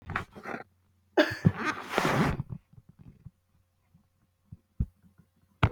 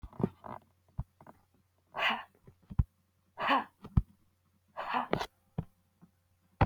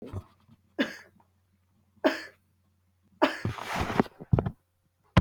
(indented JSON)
{
  "cough_length": "5.7 s",
  "cough_amplitude": 13812,
  "cough_signal_mean_std_ratio": 0.35,
  "exhalation_length": "6.7 s",
  "exhalation_amplitude": 9686,
  "exhalation_signal_mean_std_ratio": 0.31,
  "three_cough_length": "5.2 s",
  "three_cough_amplitude": 14928,
  "three_cough_signal_mean_std_ratio": 0.31,
  "survey_phase": "beta (2021-08-13 to 2022-03-07)",
  "age": "65+",
  "gender": "Female",
  "wearing_mask": "No",
  "symptom_none": true,
  "smoker_status": "Ex-smoker",
  "respiratory_condition_asthma": false,
  "respiratory_condition_other": false,
  "recruitment_source": "REACT",
  "submission_delay": "1 day",
  "covid_test_result": "Negative",
  "covid_test_method": "RT-qPCR",
  "influenza_a_test_result": "Negative",
  "influenza_b_test_result": "Negative"
}